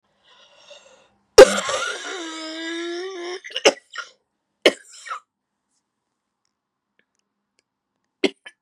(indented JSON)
{
  "cough_length": "8.6 s",
  "cough_amplitude": 32768,
  "cough_signal_mean_std_ratio": 0.22,
  "survey_phase": "beta (2021-08-13 to 2022-03-07)",
  "age": "18-44",
  "gender": "Female",
  "wearing_mask": "No",
  "symptom_new_continuous_cough": true,
  "symptom_runny_or_blocked_nose": true,
  "symptom_sore_throat": true,
  "symptom_fatigue": true,
  "symptom_fever_high_temperature": true,
  "symptom_headache": true,
  "symptom_other": true,
  "symptom_onset": "3 days",
  "smoker_status": "Never smoked",
  "respiratory_condition_asthma": false,
  "respiratory_condition_other": false,
  "recruitment_source": "Test and Trace",
  "submission_delay": "1 day",
  "covid_test_result": "Positive",
  "covid_test_method": "RT-qPCR",
  "covid_ct_value": 22.1,
  "covid_ct_gene": "ORF1ab gene"
}